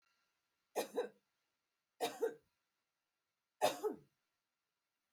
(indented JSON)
{
  "three_cough_length": "5.1 s",
  "three_cough_amplitude": 2899,
  "three_cough_signal_mean_std_ratio": 0.29,
  "survey_phase": "alpha (2021-03-01 to 2021-08-12)",
  "age": "45-64",
  "gender": "Female",
  "wearing_mask": "No",
  "symptom_none": true,
  "smoker_status": "Never smoked",
  "respiratory_condition_asthma": false,
  "respiratory_condition_other": false,
  "recruitment_source": "REACT",
  "submission_delay": "2 days",
  "covid_test_result": "Negative",
  "covid_test_method": "RT-qPCR"
}